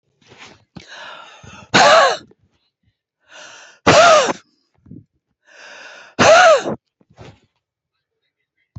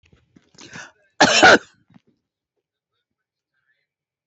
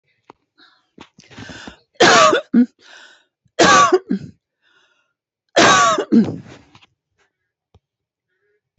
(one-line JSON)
{"exhalation_length": "8.8 s", "exhalation_amplitude": 30545, "exhalation_signal_mean_std_ratio": 0.35, "cough_length": "4.3 s", "cough_amplitude": 29120, "cough_signal_mean_std_ratio": 0.23, "three_cough_length": "8.8 s", "three_cough_amplitude": 31407, "three_cough_signal_mean_std_ratio": 0.37, "survey_phase": "beta (2021-08-13 to 2022-03-07)", "age": "65+", "gender": "Female", "wearing_mask": "No", "symptom_cough_any": true, "symptom_shortness_of_breath": true, "smoker_status": "Ex-smoker", "respiratory_condition_asthma": true, "respiratory_condition_other": true, "recruitment_source": "REACT", "submission_delay": "3 days", "covid_test_result": "Negative", "covid_test_method": "RT-qPCR", "influenza_a_test_result": "Negative", "influenza_b_test_result": "Negative"}